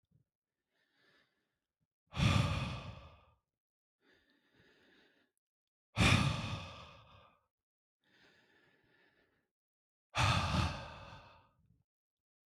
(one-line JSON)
{"exhalation_length": "12.5 s", "exhalation_amplitude": 5666, "exhalation_signal_mean_std_ratio": 0.32, "survey_phase": "beta (2021-08-13 to 2022-03-07)", "age": "18-44", "gender": "Male", "wearing_mask": "No", "symptom_none": true, "smoker_status": "Ex-smoker", "respiratory_condition_asthma": false, "respiratory_condition_other": false, "recruitment_source": "REACT", "submission_delay": "2 days", "covid_test_result": "Negative", "covid_test_method": "RT-qPCR", "influenza_a_test_result": "Negative", "influenza_b_test_result": "Negative"}